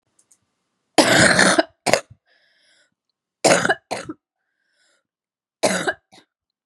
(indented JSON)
{
  "three_cough_length": "6.7 s",
  "three_cough_amplitude": 32768,
  "three_cough_signal_mean_std_ratio": 0.35,
  "survey_phase": "beta (2021-08-13 to 2022-03-07)",
  "age": "18-44",
  "gender": "Female",
  "wearing_mask": "No",
  "symptom_cough_any": true,
  "symptom_new_continuous_cough": true,
  "symptom_sore_throat": true,
  "symptom_headache": true,
  "symptom_other": true,
  "smoker_status": "Never smoked",
  "respiratory_condition_asthma": false,
  "respiratory_condition_other": false,
  "recruitment_source": "Test and Trace",
  "submission_delay": "-1 day",
  "covid_test_result": "Positive",
  "covid_test_method": "LFT"
}